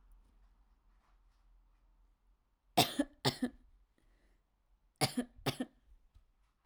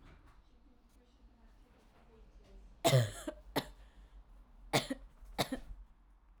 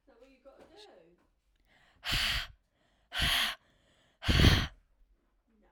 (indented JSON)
{
  "cough_length": "6.7 s",
  "cough_amplitude": 7832,
  "cough_signal_mean_std_ratio": 0.25,
  "three_cough_length": "6.4 s",
  "three_cough_amplitude": 5645,
  "three_cough_signal_mean_std_ratio": 0.33,
  "exhalation_length": "5.7 s",
  "exhalation_amplitude": 11446,
  "exhalation_signal_mean_std_ratio": 0.35,
  "survey_phase": "alpha (2021-03-01 to 2021-08-12)",
  "age": "18-44",
  "gender": "Female",
  "wearing_mask": "No",
  "symptom_cough_any": true,
  "symptom_new_continuous_cough": true,
  "symptom_shortness_of_breath": true,
  "symptom_headache": true,
  "smoker_status": "Never smoked",
  "respiratory_condition_asthma": false,
  "respiratory_condition_other": false,
  "recruitment_source": "Test and Trace",
  "submission_delay": "2 days",
  "covid_test_result": "Positive",
  "covid_test_method": "RT-qPCR",
  "covid_ct_value": 32.2,
  "covid_ct_gene": "ORF1ab gene",
  "covid_ct_mean": 32.4,
  "covid_viral_load": "23 copies/ml",
  "covid_viral_load_category": "Minimal viral load (< 10K copies/ml)"
}